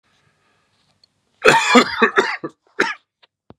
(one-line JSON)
{"cough_length": "3.6 s", "cough_amplitude": 32768, "cough_signal_mean_std_ratio": 0.37, "survey_phase": "beta (2021-08-13 to 2022-03-07)", "age": "45-64", "gender": "Male", "wearing_mask": "No", "symptom_cough_any": true, "symptom_new_continuous_cough": true, "symptom_runny_or_blocked_nose": true, "symptom_sore_throat": true, "symptom_fatigue": true, "symptom_headache": true, "symptom_onset": "2 days", "smoker_status": "Never smoked", "respiratory_condition_asthma": false, "respiratory_condition_other": false, "recruitment_source": "Test and Trace", "submission_delay": "1 day", "covid_test_result": "Positive", "covid_test_method": "RT-qPCR", "covid_ct_value": 25.1, "covid_ct_gene": "N gene"}